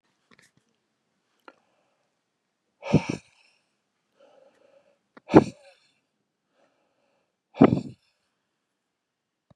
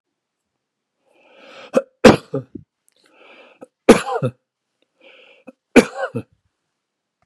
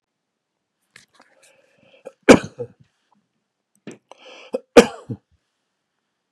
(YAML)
exhalation_length: 9.6 s
exhalation_amplitude: 31551
exhalation_signal_mean_std_ratio: 0.15
three_cough_length: 7.3 s
three_cough_amplitude: 32768
three_cough_signal_mean_std_ratio: 0.22
cough_length: 6.3 s
cough_amplitude: 32768
cough_signal_mean_std_ratio: 0.15
survey_phase: beta (2021-08-13 to 2022-03-07)
age: 65+
gender: Male
wearing_mask: 'No'
symptom_none: true
smoker_status: Never smoked
respiratory_condition_asthma: false
respiratory_condition_other: false
recruitment_source: REACT
submission_delay: 3 days
covid_test_result: Negative
covid_test_method: RT-qPCR
influenza_a_test_result: Negative
influenza_b_test_result: Negative